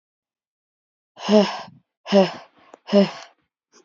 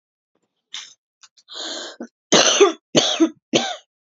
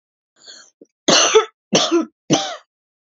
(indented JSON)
{
  "exhalation_length": "3.8 s",
  "exhalation_amplitude": 26105,
  "exhalation_signal_mean_std_ratio": 0.32,
  "cough_length": "4.0 s",
  "cough_amplitude": 32767,
  "cough_signal_mean_std_ratio": 0.4,
  "three_cough_length": "3.1 s",
  "three_cough_amplitude": 30748,
  "three_cough_signal_mean_std_ratio": 0.43,
  "survey_phase": "beta (2021-08-13 to 2022-03-07)",
  "age": "18-44",
  "gender": "Female",
  "wearing_mask": "No",
  "symptom_cough_any": true,
  "symptom_onset": "8 days",
  "smoker_status": "Current smoker (11 or more cigarettes per day)",
  "respiratory_condition_asthma": false,
  "respiratory_condition_other": false,
  "recruitment_source": "REACT",
  "submission_delay": "2 days",
  "covid_test_result": "Negative",
  "covid_test_method": "RT-qPCR"
}